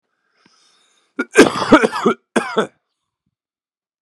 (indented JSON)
{
  "cough_length": "4.0 s",
  "cough_amplitude": 32768,
  "cough_signal_mean_std_ratio": 0.32,
  "survey_phase": "beta (2021-08-13 to 2022-03-07)",
  "age": "18-44",
  "gender": "Male",
  "wearing_mask": "No",
  "symptom_cough_any": true,
  "symptom_new_continuous_cough": true,
  "symptom_runny_or_blocked_nose": true,
  "symptom_headache": true,
  "symptom_change_to_sense_of_smell_or_taste": true,
  "symptom_loss_of_taste": true,
  "symptom_onset": "4 days",
  "smoker_status": "Never smoked",
  "respiratory_condition_asthma": false,
  "respiratory_condition_other": false,
  "recruitment_source": "Test and Trace",
  "submission_delay": "2 days",
  "covid_test_result": "Positive",
  "covid_test_method": "RT-qPCR",
  "covid_ct_value": 14.6,
  "covid_ct_gene": "ORF1ab gene",
  "covid_ct_mean": 15.6,
  "covid_viral_load": "7400000 copies/ml",
  "covid_viral_load_category": "High viral load (>1M copies/ml)"
}